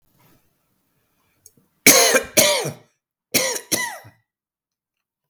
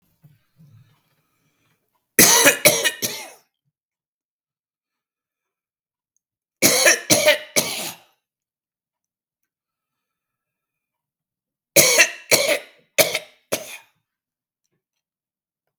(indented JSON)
{
  "cough_length": "5.3 s",
  "cough_amplitude": 32768,
  "cough_signal_mean_std_ratio": 0.34,
  "three_cough_length": "15.8 s",
  "three_cough_amplitude": 32768,
  "three_cough_signal_mean_std_ratio": 0.3,
  "survey_phase": "beta (2021-08-13 to 2022-03-07)",
  "age": "45-64",
  "gender": "Male",
  "wearing_mask": "No",
  "symptom_none": true,
  "symptom_onset": "12 days",
  "smoker_status": "Never smoked",
  "respiratory_condition_asthma": false,
  "respiratory_condition_other": false,
  "recruitment_source": "REACT",
  "submission_delay": "2 days",
  "covid_test_result": "Negative",
  "covid_test_method": "RT-qPCR"
}